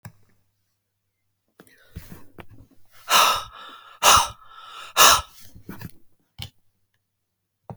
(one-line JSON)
{"exhalation_length": "7.8 s", "exhalation_amplitude": 32768, "exhalation_signal_mean_std_ratio": 0.29, "survey_phase": "alpha (2021-03-01 to 2021-08-12)", "age": "65+", "gender": "Male", "wearing_mask": "No", "symptom_none": true, "smoker_status": "Never smoked", "respiratory_condition_asthma": false, "respiratory_condition_other": false, "recruitment_source": "REACT", "submission_delay": "4 days", "covid_test_method": "RT-qPCR", "covid_ct_value": 35.0, "covid_ct_gene": "N gene"}